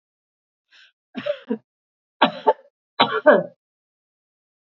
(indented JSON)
{
  "three_cough_length": "4.8 s",
  "three_cough_amplitude": 31661,
  "three_cough_signal_mean_std_ratio": 0.27,
  "survey_phase": "beta (2021-08-13 to 2022-03-07)",
  "age": "65+",
  "gender": "Female",
  "wearing_mask": "No",
  "symptom_none": true,
  "smoker_status": "Ex-smoker",
  "respiratory_condition_asthma": false,
  "respiratory_condition_other": false,
  "recruitment_source": "REACT",
  "submission_delay": "5 days",
  "covid_test_result": "Negative",
  "covid_test_method": "RT-qPCR",
  "influenza_a_test_result": "Negative",
  "influenza_b_test_result": "Negative"
}